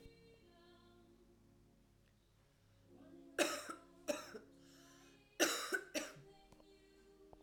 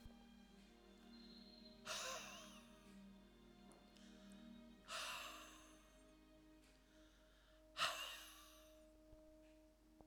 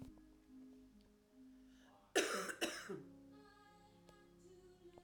{"three_cough_length": "7.4 s", "three_cough_amplitude": 3161, "three_cough_signal_mean_std_ratio": 0.35, "exhalation_length": "10.1 s", "exhalation_amplitude": 1340, "exhalation_signal_mean_std_ratio": 0.57, "cough_length": "5.0 s", "cough_amplitude": 3199, "cough_signal_mean_std_ratio": 0.41, "survey_phase": "alpha (2021-03-01 to 2021-08-12)", "age": "18-44", "gender": "Female", "wearing_mask": "No", "symptom_loss_of_taste": true, "smoker_status": "Current smoker (e-cigarettes or vapes only)", "respiratory_condition_asthma": false, "respiratory_condition_other": false, "recruitment_source": "Test and Trace", "submission_delay": "2 days", "covid_test_result": "Positive", "covid_test_method": "RT-qPCR", "covid_ct_value": 19.1, "covid_ct_gene": "ORF1ab gene", "covid_ct_mean": 19.5, "covid_viral_load": "410000 copies/ml", "covid_viral_load_category": "Low viral load (10K-1M copies/ml)"}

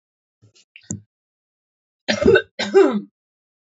{"cough_length": "3.8 s", "cough_amplitude": 26573, "cough_signal_mean_std_ratio": 0.32, "survey_phase": "beta (2021-08-13 to 2022-03-07)", "age": "45-64", "gender": "Female", "wearing_mask": "No", "symptom_cough_any": true, "symptom_runny_or_blocked_nose": true, "symptom_sore_throat": true, "symptom_fatigue": true, "symptom_headache": true, "smoker_status": "Current smoker (1 to 10 cigarettes per day)", "respiratory_condition_asthma": false, "respiratory_condition_other": false, "recruitment_source": "Test and Trace", "submission_delay": "2 days", "covid_test_result": "Positive", "covid_test_method": "RT-qPCR", "covid_ct_value": 30.5, "covid_ct_gene": "ORF1ab gene", "covid_ct_mean": 31.7, "covid_viral_load": "39 copies/ml", "covid_viral_load_category": "Minimal viral load (< 10K copies/ml)"}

